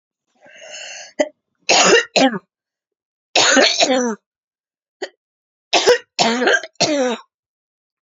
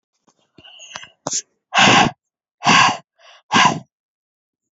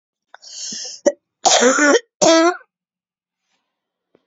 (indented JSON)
{
  "three_cough_length": "8.0 s",
  "three_cough_amplitude": 32767,
  "three_cough_signal_mean_std_ratio": 0.46,
  "exhalation_length": "4.8 s",
  "exhalation_amplitude": 32767,
  "exhalation_signal_mean_std_ratio": 0.38,
  "cough_length": "4.3 s",
  "cough_amplitude": 32767,
  "cough_signal_mean_std_ratio": 0.41,
  "survey_phase": "beta (2021-08-13 to 2022-03-07)",
  "age": "65+",
  "gender": "Female",
  "wearing_mask": "No",
  "symptom_cough_any": true,
  "symptom_abdominal_pain": true,
  "symptom_diarrhoea": true,
  "symptom_fatigue": true,
  "symptom_change_to_sense_of_smell_or_taste": true,
  "symptom_loss_of_taste": true,
  "symptom_onset": "10 days",
  "smoker_status": "Never smoked",
  "respiratory_condition_asthma": false,
  "respiratory_condition_other": false,
  "recruitment_source": "Test and Trace",
  "submission_delay": "4 days",
  "covid_test_result": "Positive",
  "covid_test_method": "RT-qPCR",
  "covid_ct_value": 27.3,
  "covid_ct_gene": "ORF1ab gene",
  "covid_ct_mean": 27.8,
  "covid_viral_load": "740 copies/ml",
  "covid_viral_load_category": "Minimal viral load (< 10K copies/ml)"
}